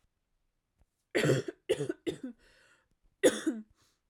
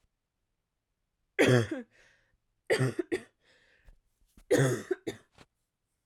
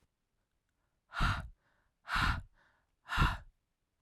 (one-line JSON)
{"cough_length": "4.1 s", "cough_amplitude": 8637, "cough_signal_mean_std_ratio": 0.35, "three_cough_length": "6.1 s", "three_cough_amplitude": 9648, "three_cough_signal_mean_std_ratio": 0.33, "exhalation_length": "4.0 s", "exhalation_amplitude": 4327, "exhalation_signal_mean_std_ratio": 0.37, "survey_phase": "alpha (2021-03-01 to 2021-08-12)", "age": "18-44", "gender": "Female", "wearing_mask": "No", "symptom_cough_any": true, "symptom_fatigue": true, "symptom_headache": true, "symptom_change_to_sense_of_smell_or_taste": true, "symptom_loss_of_taste": true, "smoker_status": "Never smoked", "respiratory_condition_asthma": false, "respiratory_condition_other": false, "recruitment_source": "Test and Trace", "submission_delay": "2 days", "covid_test_result": "Positive", "covid_test_method": "RT-qPCR"}